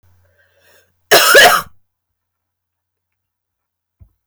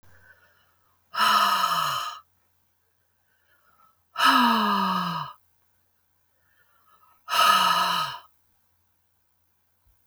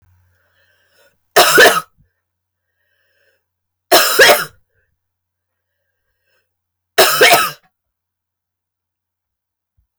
{"cough_length": "4.3 s", "cough_amplitude": 32768, "cough_signal_mean_std_ratio": 0.29, "exhalation_length": "10.1 s", "exhalation_amplitude": 16291, "exhalation_signal_mean_std_ratio": 0.45, "three_cough_length": "10.0 s", "three_cough_amplitude": 32768, "three_cough_signal_mean_std_ratio": 0.31, "survey_phase": "beta (2021-08-13 to 2022-03-07)", "age": "45-64", "gender": "Female", "wearing_mask": "No", "symptom_cough_any": true, "symptom_runny_or_blocked_nose": true, "symptom_sore_throat": true, "symptom_fever_high_temperature": true, "symptom_headache": true, "symptom_change_to_sense_of_smell_or_taste": true, "symptom_loss_of_taste": true, "symptom_other": true, "symptom_onset": "4 days", "smoker_status": "Never smoked", "respiratory_condition_asthma": false, "respiratory_condition_other": false, "recruitment_source": "Test and Trace", "submission_delay": "2 days", "covid_test_result": "Positive", "covid_test_method": "RT-qPCR", "covid_ct_value": 15.3, "covid_ct_gene": "ORF1ab gene", "covid_ct_mean": 15.8, "covid_viral_load": "6700000 copies/ml", "covid_viral_load_category": "High viral load (>1M copies/ml)"}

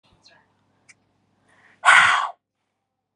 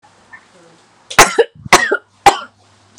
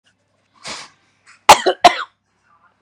{"exhalation_length": "3.2 s", "exhalation_amplitude": 30279, "exhalation_signal_mean_std_ratio": 0.28, "three_cough_length": "3.0 s", "three_cough_amplitude": 32768, "three_cough_signal_mean_std_ratio": 0.33, "cough_length": "2.8 s", "cough_amplitude": 32768, "cough_signal_mean_std_ratio": 0.24, "survey_phase": "beta (2021-08-13 to 2022-03-07)", "age": "18-44", "gender": "Female", "wearing_mask": "No", "symptom_none": true, "smoker_status": "Never smoked", "respiratory_condition_asthma": true, "respiratory_condition_other": false, "recruitment_source": "REACT", "submission_delay": "2 days", "covid_test_result": "Negative", "covid_test_method": "RT-qPCR"}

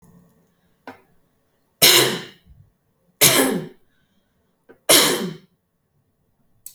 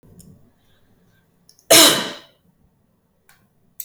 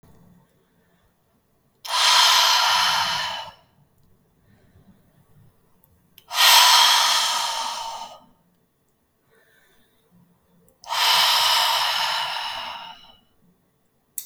{"three_cough_length": "6.7 s", "three_cough_amplitude": 32768, "three_cough_signal_mean_std_ratio": 0.32, "cough_length": "3.8 s", "cough_amplitude": 32768, "cough_signal_mean_std_ratio": 0.24, "exhalation_length": "14.3 s", "exhalation_amplitude": 28850, "exhalation_signal_mean_std_ratio": 0.47, "survey_phase": "beta (2021-08-13 to 2022-03-07)", "age": "18-44", "gender": "Female", "wearing_mask": "No", "symptom_none": true, "smoker_status": "Never smoked", "respiratory_condition_asthma": false, "respiratory_condition_other": false, "recruitment_source": "REACT", "submission_delay": "1 day", "covid_test_result": "Negative", "covid_test_method": "RT-qPCR", "influenza_a_test_result": "Negative", "influenza_b_test_result": "Negative"}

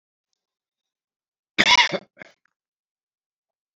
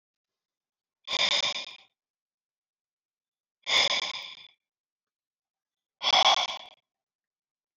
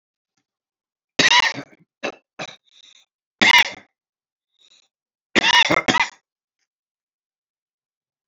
{"cough_length": "3.8 s", "cough_amplitude": 26979, "cough_signal_mean_std_ratio": 0.22, "exhalation_length": "7.8 s", "exhalation_amplitude": 11794, "exhalation_signal_mean_std_ratio": 0.33, "three_cough_length": "8.3 s", "three_cough_amplitude": 30094, "three_cough_signal_mean_std_ratio": 0.29, "survey_phase": "beta (2021-08-13 to 2022-03-07)", "age": "65+", "gender": "Male", "wearing_mask": "No", "symptom_cough_any": true, "symptom_runny_or_blocked_nose": true, "symptom_diarrhoea": true, "symptom_fatigue": true, "symptom_headache": true, "symptom_change_to_sense_of_smell_or_taste": true, "symptom_onset": "3 days", "smoker_status": "Never smoked", "respiratory_condition_asthma": false, "respiratory_condition_other": false, "recruitment_source": "Test and Trace", "submission_delay": "1 day", "covid_test_result": "Positive", "covid_test_method": "RT-qPCR", "covid_ct_value": 20.8, "covid_ct_gene": "ORF1ab gene", "covid_ct_mean": 21.2, "covid_viral_load": "110000 copies/ml", "covid_viral_load_category": "Low viral load (10K-1M copies/ml)"}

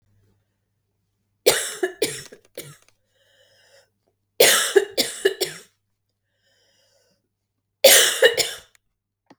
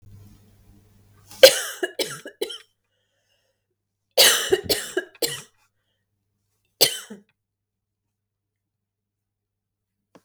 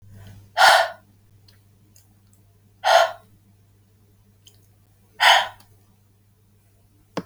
{"three_cough_length": "9.4 s", "three_cough_amplitude": 32768, "three_cough_signal_mean_std_ratio": 0.31, "cough_length": "10.2 s", "cough_amplitude": 32768, "cough_signal_mean_std_ratio": 0.23, "exhalation_length": "7.3 s", "exhalation_amplitude": 31830, "exhalation_signal_mean_std_ratio": 0.29, "survey_phase": "beta (2021-08-13 to 2022-03-07)", "age": "45-64", "gender": "Female", "wearing_mask": "No", "symptom_runny_or_blocked_nose": true, "symptom_sore_throat": true, "symptom_onset": "7 days", "smoker_status": "Never smoked", "respiratory_condition_asthma": false, "respiratory_condition_other": false, "recruitment_source": "REACT", "submission_delay": "2 days", "covid_test_result": "Negative", "covid_test_method": "RT-qPCR", "influenza_a_test_result": "Negative", "influenza_b_test_result": "Negative"}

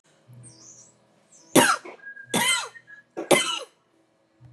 {"cough_length": "4.5 s", "cough_amplitude": 29363, "cough_signal_mean_std_ratio": 0.35, "survey_phase": "beta (2021-08-13 to 2022-03-07)", "age": "65+", "gender": "Female", "wearing_mask": "No", "symptom_none": true, "smoker_status": "Never smoked", "respiratory_condition_asthma": false, "respiratory_condition_other": false, "recruitment_source": "REACT", "submission_delay": "5 days", "covid_test_result": "Negative", "covid_test_method": "RT-qPCR", "influenza_a_test_result": "Negative", "influenza_b_test_result": "Negative"}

